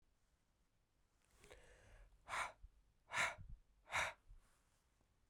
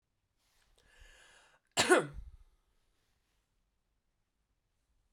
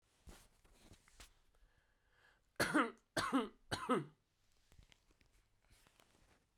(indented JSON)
{
  "exhalation_length": "5.3 s",
  "exhalation_amplitude": 1384,
  "exhalation_signal_mean_std_ratio": 0.35,
  "cough_length": "5.1 s",
  "cough_amplitude": 8023,
  "cough_signal_mean_std_ratio": 0.2,
  "three_cough_length": "6.6 s",
  "three_cough_amplitude": 2942,
  "three_cough_signal_mean_std_ratio": 0.3,
  "survey_phase": "beta (2021-08-13 to 2022-03-07)",
  "age": "18-44",
  "gender": "Female",
  "wearing_mask": "No",
  "symptom_none": true,
  "smoker_status": "Never smoked",
  "respiratory_condition_asthma": false,
  "respiratory_condition_other": false,
  "recruitment_source": "REACT",
  "submission_delay": "2 days",
  "covid_test_result": "Negative",
  "covid_test_method": "RT-qPCR",
  "influenza_a_test_result": "Negative",
  "influenza_b_test_result": "Negative"
}